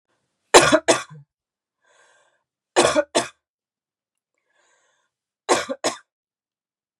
{
  "three_cough_length": "7.0 s",
  "three_cough_amplitude": 32768,
  "three_cough_signal_mean_std_ratio": 0.26,
  "survey_phase": "beta (2021-08-13 to 2022-03-07)",
  "age": "45-64",
  "gender": "Female",
  "wearing_mask": "No",
  "symptom_cough_any": true,
  "symptom_runny_or_blocked_nose": true,
  "symptom_sore_throat": true,
  "symptom_headache": true,
  "symptom_onset": "3 days",
  "smoker_status": "Never smoked",
  "respiratory_condition_asthma": false,
  "respiratory_condition_other": false,
  "recruitment_source": "Test and Trace",
  "submission_delay": "1 day",
  "covid_test_result": "Negative",
  "covid_test_method": "RT-qPCR"
}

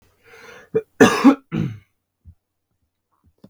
{
  "cough_length": "3.5 s",
  "cough_amplitude": 32768,
  "cough_signal_mean_std_ratio": 0.28,
  "survey_phase": "beta (2021-08-13 to 2022-03-07)",
  "age": "18-44",
  "gender": "Male",
  "wearing_mask": "No",
  "symptom_cough_any": true,
  "symptom_runny_or_blocked_nose": true,
  "symptom_sore_throat": true,
  "symptom_change_to_sense_of_smell_or_taste": true,
  "symptom_other": true,
  "symptom_onset": "5 days",
  "smoker_status": "Never smoked",
  "respiratory_condition_asthma": false,
  "respiratory_condition_other": false,
  "recruitment_source": "Test and Trace",
  "submission_delay": "2 days",
  "covid_test_result": "Positive",
  "covid_test_method": "RT-qPCR",
  "covid_ct_value": 19.5,
  "covid_ct_gene": "N gene"
}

